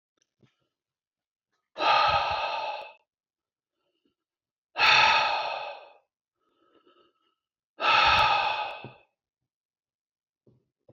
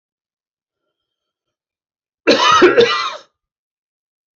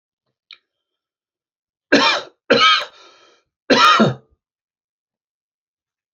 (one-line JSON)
{"exhalation_length": "10.9 s", "exhalation_amplitude": 12792, "exhalation_signal_mean_std_ratio": 0.4, "cough_length": "4.4 s", "cough_amplitude": 30293, "cough_signal_mean_std_ratio": 0.34, "three_cough_length": "6.1 s", "three_cough_amplitude": 29375, "three_cough_signal_mean_std_ratio": 0.33, "survey_phase": "beta (2021-08-13 to 2022-03-07)", "age": "45-64", "gender": "Male", "wearing_mask": "No", "symptom_none": true, "smoker_status": "Never smoked", "respiratory_condition_asthma": false, "respiratory_condition_other": false, "recruitment_source": "REACT", "submission_delay": "2 days", "covid_test_result": "Negative", "covid_test_method": "RT-qPCR", "influenza_a_test_result": "Negative", "influenza_b_test_result": "Negative"}